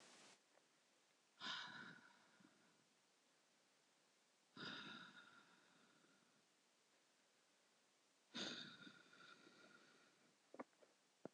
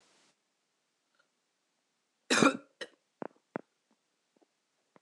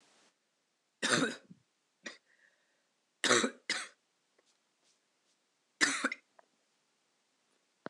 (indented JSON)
{
  "exhalation_length": "11.3 s",
  "exhalation_amplitude": 464,
  "exhalation_signal_mean_std_ratio": 0.46,
  "cough_length": "5.0 s",
  "cough_amplitude": 12904,
  "cough_signal_mean_std_ratio": 0.18,
  "three_cough_length": "7.9 s",
  "three_cough_amplitude": 8187,
  "three_cough_signal_mean_std_ratio": 0.27,
  "survey_phase": "beta (2021-08-13 to 2022-03-07)",
  "age": "18-44",
  "gender": "Female",
  "wearing_mask": "No",
  "symptom_cough_any": true,
  "symptom_new_continuous_cough": true,
  "symptom_runny_or_blocked_nose": true,
  "symptom_sore_throat": true,
  "symptom_fatigue": true,
  "symptom_fever_high_temperature": true,
  "symptom_onset": "2 days",
  "smoker_status": "Never smoked",
  "respiratory_condition_asthma": false,
  "respiratory_condition_other": false,
  "recruitment_source": "Test and Trace",
  "submission_delay": "1 day",
  "covid_test_result": "Positive",
  "covid_test_method": "RT-qPCR",
  "covid_ct_value": 21.2,
  "covid_ct_gene": "ORF1ab gene",
  "covid_ct_mean": 21.9,
  "covid_viral_load": "66000 copies/ml",
  "covid_viral_load_category": "Low viral load (10K-1M copies/ml)"
}